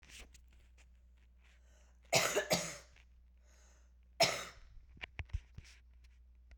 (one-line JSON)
{"cough_length": "6.6 s", "cough_amplitude": 5167, "cough_signal_mean_std_ratio": 0.34, "survey_phase": "beta (2021-08-13 to 2022-03-07)", "age": "18-44", "gender": "Female", "wearing_mask": "No", "symptom_cough_any": true, "symptom_runny_or_blocked_nose": true, "symptom_shortness_of_breath": true, "symptom_sore_throat": true, "symptom_fatigue": true, "symptom_headache": true, "symptom_change_to_sense_of_smell_or_taste": true, "symptom_onset": "5 days", "smoker_status": "Current smoker (1 to 10 cigarettes per day)", "respiratory_condition_asthma": false, "respiratory_condition_other": false, "recruitment_source": "Test and Trace", "submission_delay": "2 days", "covid_test_result": "Positive", "covid_test_method": "RT-qPCR", "covid_ct_value": 24.6, "covid_ct_gene": "ORF1ab gene", "covid_ct_mean": 25.1, "covid_viral_load": "5700 copies/ml", "covid_viral_load_category": "Minimal viral load (< 10K copies/ml)"}